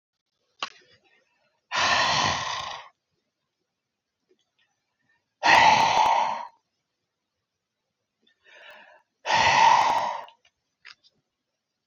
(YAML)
exhalation_length: 11.9 s
exhalation_amplitude: 19515
exhalation_signal_mean_std_ratio: 0.39
survey_phase: beta (2021-08-13 to 2022-03-07)
age: 45-64
gender: Female
wearing_mask: 'No'
symptom_cough_any: true
symptom_new_continuous_cough: true
symptom_runny_or_blocked_nose: true
symptom_sore_throat: true
symptom_diarrhoea: true
symptom_fatigue: true
symptom_headache: true
symptom_onset: 2 days
smoker_status: Never smoked
respiratory_condition_asthma: false
respiratory_condition_other: false
recruitment_source: Test and Trace
submission_delay: 1 day
covid_test_result: Positive
covid_test_method: RT-qPCR
covid_ct_value: 17.9
covid_ct_gene: ORF1ab gene
covid_ct_mean: 18.4
covid_viral_load: 950000 copies/ml
covid_viral_load_category: Low viral load (10K-1M copies/ml)